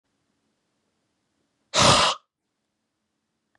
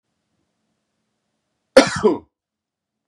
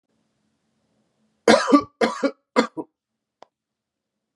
exhalation_length: 3.6 s
exhalation_amplitude: 21159
exhalation_signal_mean_std_ratio: 0.26
cough_length: 3.1 s
cough_amplitude: 32768
cough_signal_mean_std_ratio: 0.21
three_cough_length: 4.4 s
three_cough_amplitude: 31697
three_cough_signal_mean_std_ratio: 0.28
survey_phase: beta (2021-08-13 to 2022-03-07)
age: 18-44
gender: Male
wearing_mask: 'No'
symptom_none: true
smoker_status: Never smoked
respiratory_condition_asthma: false
respiratory_condition_other: false
recruitment_source: Test and Trace
submission_delay: 1 day
covid_test_result: Positive
covid_test_method: RT-qPCR
covid_ct_value: 24.8
covid_ct_gene: N gene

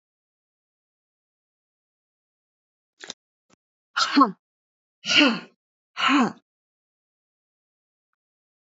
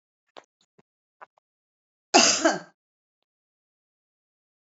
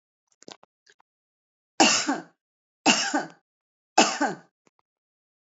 exhalation_length: 8.8 s
exhalation_amplitude: 22043
exhalation_signal_mean_std_ratio: 0.25
cough_length: 4.8 s
cough_amplitude: 30214
cough_signal_mean_std_ratio: 0.22
three_cough_length: 5.5 s
three_cough_amplitude: 25060
three_cough_signal_mean_std_ratio: 0.32
survey_phase: beta (2021-08-13 to 2022-03-07)
age: 45-64
gender: Female
wearing_mask: 'No'
symptom_none: true
smoker_status: Never smoked
respiratory_condition_asthma: false
respiratory_condition_other: false
recruitment_source: REACT
submission_delay: 1 day
covid_test_result: Negative
covid_test_method: RT-qPCR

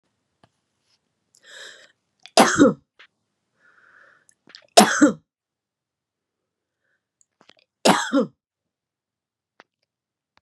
three_cough_length: 10.4 s
three_cough_amplitude: 32768
three_cough_signal_mean_std_ratio: 0.23
survey_phase: beta (2021-08-13 to 2022-03-07)
age: 45-64
gender: Female
wearing_mask: 'No'
symptom_none: true
smoker_status: Never smoked
respiratory_condition_asthma: false
respiratory_condition_other: false
recruitment_source: REACT
submission_delay: 4 days
covid_test_result: Negative
covid_test_method: RT-qPCR
influenza_a_test_result: Negative
influenza_b_test_result: Negative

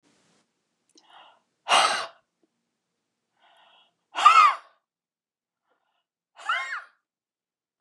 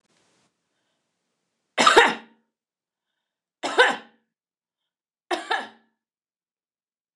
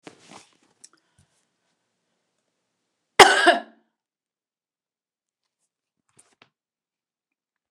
exhalation_length: 7.8 s
exhalation_amplitude: 22400
exhalation_signal_mean_std_ratio: 0.26
three_cough_length: 7.2 s
three_cough_amplitude: 29203
three_cough_signal_mean_std_ratio: 0.24
cough_length: 7.7 s
cough_amplitude: 29204
cough_signal_mean_std_ratio: 0.16
survey_phase: beta (2021-08-13 to 2022-03-07)
age: 65+
gender: Female
wearing_mask: 'No'
symptom_none: true
smoker_status: Never smoked
respiratory_condition_asthma: false
respiratory_condition_other: false
recruitment_source: REACT
submission_delay: 1 day
covid_test_result: Negative
covid_test_method: RT-qPCR
influenza_a_test_result: Negative
influenza_b_test_result: Negative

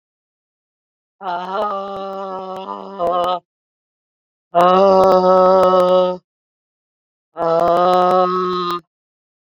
exhalation_length: 9.5 s
exhalation_amplitude: 29650
exhalation_signal_mean_std_ratio: 0.54
survey_phase: beta (2021-08-13 to 2022-03-07)
age: 45-64
gender: Female
wearing_mask: 'No'
symptom_headache: true
symptom_onset: 4 days
smoker_status: Never smoked
respiratory_condition_asthma: false
respiratory_condition_other: false
recruitment_source: Test and Trace
submission_delay: 3 days
covid_test_result: Negative
covid_test_method: RT-qPCR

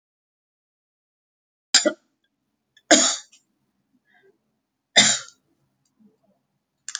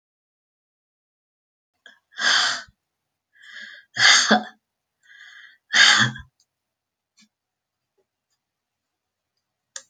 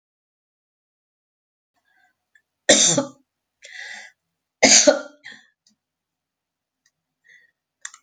cough_length: 7.0 s
cough_amplitude: 32768
cough_signal_mean_std_ratio: 0.22
exhalation_length: 9.9 s
exhalation_amplitude: 28247
exhalation_signal_mean_std_ratio: 0.28
three_cough_length: 8.0 s
three_cough_amplitude: 32768
three_cough_signal_mean_std_ratio: 0.23
survey_phase: beta (2021-08-13 to 2022-03-07)
age: 65+
gender: Female
wearing_mask: 'No'
symptom_none: true
smoker_status: Ex-smoker
respiratory_condition_asthma: false
respiratory_condition_other: false
recruitment_source: REACT
submission_delay: 1 day
covid_test_result: Negative
covid_test_method: RT-qPCR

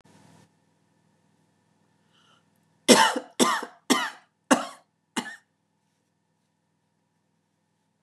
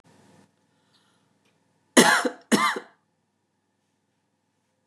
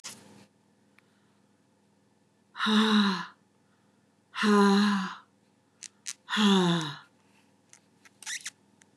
three_cough_length: 8.0 s
three_cough_amplitude: 28005
three_cough_signal_mean_std_ratio: 0.24
cough_length: 4.9 s
cough_amplitude: 29153
cough_signal_mean_std_ratio: 0.25
exhalation_length: 9.0 s
exhalation_amplitude: 10082
exhalation_signal_mean_std_ratio: 0.42
survey_phase: beta (2021-08-13 to 2022-03-07)
age: 45-64
gender: Female
wearing_mask: 'No'
symptom_none: true
smoker_status: Ex-smoker
respiratory_condition_asthma: false
respiratory_condition_other: false
recruitment_source: REACT
submission_delay: 1 day
covid_test_result: Negative
covid_test_method: RT-qPCR
influenza_a_test_result: Negative
influenza_b_test_result: Negative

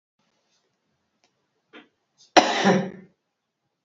cough_length: 3.8 s
cough_amplitude: 29616
cough_signal_mean_std_ratio: 0.26
survey_phase: beta (2021-08-13 to 2022-03-07)
age: 45-64
gender: Female
wearing_mask: 'No'
symptom_cough_any: true
symptom_runny_or_blocked_nose: true
symptom_onset: 5 days
smoker_status: Never smoked
respiratory_condition_asthma: false
respiratory_condition_other: false
recruitment_source: Test and Trace
submission_delay: 1 day
covid_test_result: Positive
covid_test_method: RT-qPCR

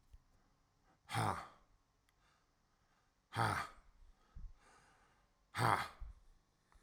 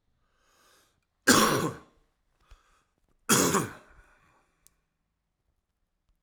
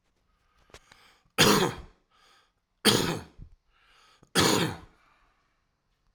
exhalation_length: 6.8 s
exhalation_amplitude: 4356
exhalation_signal_mean_std_ratio: 0.33
cough_length: 6.2 s
cough_amplitude: 19746
cough_signal_mean_std_ratio: 0.28
three_cough_length: 6.1 s
three_cough_amplitude: 15418
three_cough_signal_mean_std_ratio: 0.33
survey_phase: alpha (2021-03-01 to 2021-08-12)
age: 45-64
gender: Male
wearing_mask: 'No'
symptom_cough_any: true
symptom_new_continuous_cough: true
symptom_fatigue: true
symptom_headache: true
symptom_change_to_sense_of_smell_or_taste: true
symptom_onset: 5 days
smoker_status: Ex-smoker
respiratory_condition_asthma: false
respiratory_condition_other: false
recruitment_source: Test and Trace
submission_delay: 2 days
covid_test_result: Positive
covid_test_method: RT-qPCR
covid_ct_value: 16.1
covid_ct_gene: ORF1ab gene
covid_ct_mean: 16.7
covid_viral_load: 3200000 copies/ml
covid_viral_load_category: High viral load (>1M copies/ml)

